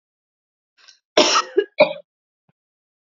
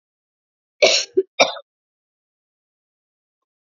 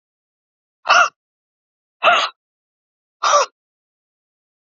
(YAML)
three_cough_length: 3.1 s
three_cough_amplitude: 30069
three_cough_signal_mean_std_ratio: 0.29
cough_length: 3.8 s
cough_amplitude: 28418
cough_signal_mean_std_ratio: 0.24
exhalation_length: 4.7 s
exhalation_amplitude: 28456
exhalation_signal_mean_std_ratio: 0.3
survey_phase: beta (2021-08-13 to 2022-03-07)
age: 45-64
gender: Female
wearing_mask: 'No'
symptom_none: true
smoker_status: Never smoked
respiratory_condition_asthma: false
respiratory_condition_other: false
recruitment_source: REACT
submission_delay: 6 days
covid_test_result: Negative
covid_test_method: RT-qPCR
influenza_a_test_result: Negative
influenza_b_test_result: Negative